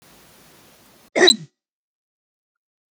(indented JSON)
{
  "cough_length": "2.9 s",
  "cough_amplitude": 31770,
  "cough_signal_mean_std_ratio": 0.21,
  "survey_phase": "beta (2021-08-13 to 2022-03-07)",
  "age": "18-44",
  "gender": "Male",
  "wearing_mask": "No",
  "symptom_none": true,
  "smoker_status": "Never smoked",
  "respiratory_condition_asthma": false,
  "respiratory_condition_other": false,
  "recruitment_source": "REACT",
  "submission_delay": "2 days",
  "covid_test_result": "Negative",
  "covid_test_method": "RT-qPCR",
  "influenza_a_test_result": "Negative",
  "influenza_b_test_result": "Negative"
}